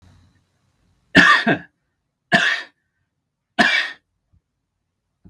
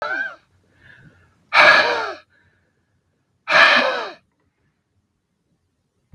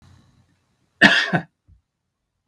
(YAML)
three_cough_length: 5.3 s
three_cough_amplitude: 32768
three_cough_signal_mean_std_ratio: 0.33
exhalation_length: 6.1 s
exhalation_amplitude: 32768
exhalation_signal_mean_std_ratio: 0.35
cough_length: 2.5 s
cough_amplitude: 32768
cough_signal_mean_std_ratio: 0.28
survey_phase: beta (2021-08-13 to 2022-03-07)
age: 45-64
gender: Male
wearing_mask: 'No'
symptom_none: true
smoker_status: Never smoked
respiratory_condition_asthma: false
respiratory_condition_other: false
recruitment_source: REACT
submission_delay: 2 days
covid_test_result: Negative
covid_test_method: RT-qPCR
influenza_a_test_result: Negative
influenza_b_test_result: Negative